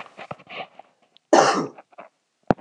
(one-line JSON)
{"cough_length": "2.6 s", "cough_amplitude": 26028, "cough_signal_mean_std_ratio": 0.31, "survey_phase": "beta (2021-08-13 to 2022-03-07)", "age": "18-44", "gender": "Male", "wearing_mask": "No", "symptom_cough_any": true, "symptom_runny_or_blocked_nose": true, "symptom_sore_throat": true, "symptom_fever_high_temperature": true, "symptom_headache": true, "symptom_onset": "3 days", "smoker_status": "Never smoked", "respiratory_condition_asthma": false, "respiratory_condition_other": false, "recruitment_source": "Test and Trace", "submission_delay": "1 day", "covid_test_result": "Positive", "covid_test_method": "RT-qPCR", "covid_ct_value": 16.9, "covid_ct_gene": "ORF1ab gene"}